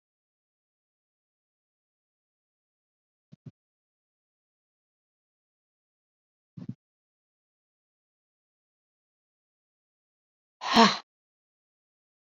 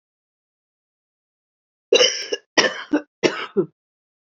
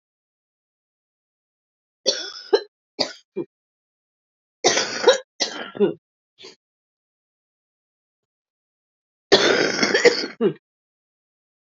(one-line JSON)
{"exhalation_length": "12.3 s", "exhalation_amplitude": 19356, "exhalation_signal_mean_std_ratio": 0.11, "cough_length": "4.4 s", "cough_amplitude": 27156, "cough_signal_mean_std_ratio": 0.32, "three_cough_length": "11.7 s", "three_cough_amplitude": 31911, "three_cough_signal_mean_std_ratio": 0.31, "survey_phase": "beta (2021-08-13 to 2022-03-07)", "age": "45-64", "gender": "Female", "wearing_mask": "No", "symptom_cough_any": true, "symptom_runny_or_blocked_nose": true, "symptom_shortness_of_breath": true, "symptom_fatigue": true, "symptom_change_to_sense_of_smell_or_taste": true, "symptom_onset": "5 days", "smoker_status": "Ex-smoker", "respiratory_condition_asthma": true, "respiratory_condition_other": false, "recruitment_source": "REACT", "submission_delay": "1 day", "covid_test_result": "Negative", "covid_test_method": "RT-qPCR", "influenza_a_test_result": "Negative", "influenza_b_test_result": "Negative"}